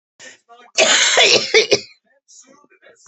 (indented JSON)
{
  "cough_length": "3.1 s",
  "cough_amplitude": 32244,
  "cough_signal_mean_std_ratio": 0.46,
  "survey_phase": "beta (2021-08-13 to 2022-03-07)",
  "age": "45-64",
  "gender": "Female",
  "wearing_mask": "No",
  "symptom_cough_any": true,
  "symptom_new_continuous_cough": true,
  "symptom_runny_or_blocked_nose": true,
  "symptom_shortness_of_breath": true,
  "symptom_sore_throat": true,
  "symptom_fatigue": true,
  "symptom_headache": true,
  "symptom_onset": "3 days",
  "smoker_status": "Never smoked",
  "respiratory_condition_asthma": true,
  "respiratory_condition_other": false,
  "recruitment_source": "Test and Trace",
  "submission_delay": "1 day",
  "covid_test_result": "Negative",
  "covid_test_method": "RT-qPCR"
}